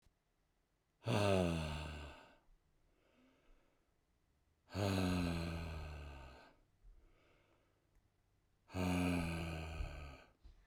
{
  "exhalation_length": "10.7 s",
  "exhalation_amplitude": 2857,
  "exhalation_signal_mean_std_ratio": 0.48,
  "survey_phase": "beta (2021-08-13 to 2022-03-07)",
  "age": "45-64",
  "gender": "Male",
  "wearing_mask": "No",
  "symptom_cough_any": true,
  "symptom_runny_or_blocked_nose": true,
  "symptom_shortness_of_breath": true,
  "symptom_sore_throat": true,
  "symptom_fatigue": true,
  "symptom_fever_high_temperature": true,
  "symptom_headache": true,
  "symptom_change_to_sense_of_smell_or_taste": true,
  "symptom_loss_of_taste": true,
  "smoker_status": "Never smoked",
  "respiratory_condition_asthma": false,
  "respiratory_condition_other": false,
  "recruitment_source": "Test and Trace",
  "submission_delay": "1 day",
  "covid_test_result": "Positive",
  "covid_test_method": "RT-qPCR",
  "covid_ct_value": 28.7,
  "covid_ct_gene": "ORF1ab gene"
}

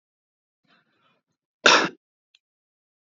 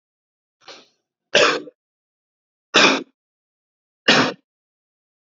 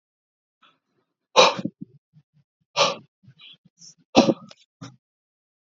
{
  "cough_length": "3.2 s",
  "cough_amplitude": 27581,
  "cough_signal_mean_std_ratio": 0.2,
  "three_cough_length": "5.4 s",
  "three_cough_amplitude": 32767,
  "three_cough_signal_mean_std_ratio": 0.29,
  "exhalation_length": "5.7 s",
  "exhalation_amplitude": 28049,
  "exhalation_signal_mean_std_ratio": 0.24,
  "survey_phase": "beta (2021-08-13 to 2022-03-07)",
  "age": "18-44",
  "gender": "Male",
  "wearing_mask": "No",
  "symptom_runny_or_blocked_nose": true,
  "smoker_status": "Current smoker (1 to 10 cigarettes per day)",
  "respiratory_condition_asthma": false,
  "respiratory_condition_other": false,
  "recruitment_source": "REACT",
  "submission_delay": "2 days",
  "covid_test_result": "Negative",
  "covid_test_method": "RT-qPCR"
}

